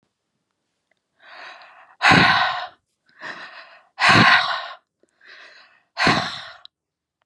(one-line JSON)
{"exhalation_length": "7.3 s", "exhalation_amplitude": 29664, "exhalation_signal_mean_std_ratio": 0.38, "survey_phase": "beta (2021-08-13 to 2022-03-07)", "age": "45-64", "gender": "Female", "wearing_mask": "No", "symptom_cough_any": true, "symptom_fatigue": true, "symptom_headache": true, "symptom_onset": "2 days", "smoker_status": "Ex-smoker", "respiratory_condition_asthma": false, "respiratory_condition_other": false, "recruitment_source": "Test and Trace", "submission_delay": "2 days", "covid_test_result": "Negative", "covid_test_method": "RT-qPCR"}